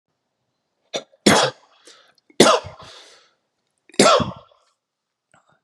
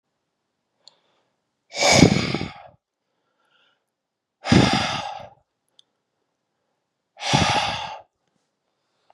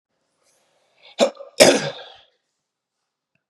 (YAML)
three_cough_length: 5.6 s
three_cough_amplitude: 32768
three_cough_signal_mean_std_ratio: 0.29
exhalation_length: 9.1 s
exhalation_amplitude: 32768
exhalation_signal_mean_std_ratio: 0.33
cough_length: 3.5 s
cough_amplitude: 32768
cough_signal_mean_std_ratio: 0.25
survey_phase: beta (2021-08-13 to 2022-03-07)
age: 18-44
gender: Male
wearing_mask: 'No'
symptom_none: true
smoker_status: Never smoked
respiratory_condition_asthma: false
respiratory_condition_other: false
recruitment_source: REACT
submission_delay: 7 days
covid_test_result: Negative
covid_test_method: RT-qPCR
influenza_a_test_result: Unknown/Void
influenza_b_test_result: Unknown/Void